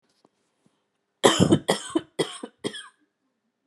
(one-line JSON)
{"three_cough_length": "3.7 s", "three_cough_amplitude": 32767, "three_cough_signal_mean_std_ratio": 0.31, "survey_phase": "beta (2021-08-13 to 2022-03-07)", "age": "45-64", "gender": "Female", "wearing_mask": "No", "symptom_cough_any": true, "smoker_status": "Never smoked", "respiratory_condition_asthma": false, "respiratory_condition_other": false, "recruitment_source": "REACT", "submission_delay": "1 day", "covid_test_result": "Negative", "covid_test_method": "RT-qPCR"}